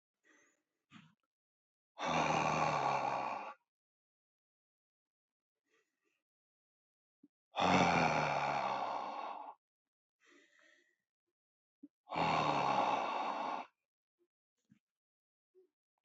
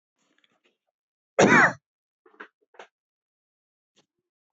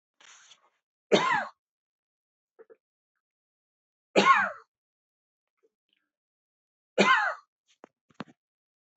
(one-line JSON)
{"exhalation_length": "16.0 s", "exhalation_amplitude": 4683, "exhalation_signal_mean_std_ratio": 0.45, "cough_length": "4.5 s", "cough_amplitude": 19788, "cough_signal_mean_std_ratio": 0.22, "three_cough_length": "9.0 s", "three_cough_amplitude": 15790, "three_cough_signal_mean_std_ratio": 0.26, "survey_phase": "beta (2021-08-13 to 2022-03-07)", "age": "45-64", "gender": "Male", "wearing_mask": "No", "symptom_none": true, "smoker_status": "Never smoked", "respiratory_condition_asthma": false, "respiratory_condition_other": false, "recruitment_source": "REACT", "submission_delay": "3 days", "covid_test_result": "Negative", "covid_test_method": "RT-qPCR", "influenza_a_test_result": "Negative", "influenza_b_test_result": "Negative"}